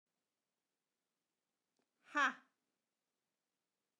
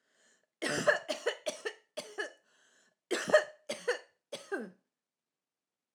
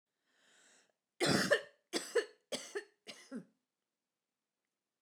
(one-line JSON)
{"exhalation_length": "4.0 s", "exhalation_amplitude": 2626, "exhalation_signal_mean_std_ratio": 0.16, "three_cough_length": "5.9 s", "three_cough_amplitude": 9122, "three_cough_signal_mean_std_ratio": 0.35, "cough_length": "5.0 s", "cough_amplitude": 5230, "cough_signal_mean_std_ratio": 0.31, "survey_phase": "alpha (2021-03-01 to 2021-08-12)", "age": "45-64", "gender": "Female", "wearing_mask": "No", "symptom_none": true, "smoker_status": "Ex-smoker", "respiratory_condition_asthma": true, "respiratory_condition_other": false, "recruitment_source": "REACT", "submission_delay": "4 days", "covid_test_result": "Negative", "covid_test_method": "RT-qPCR"}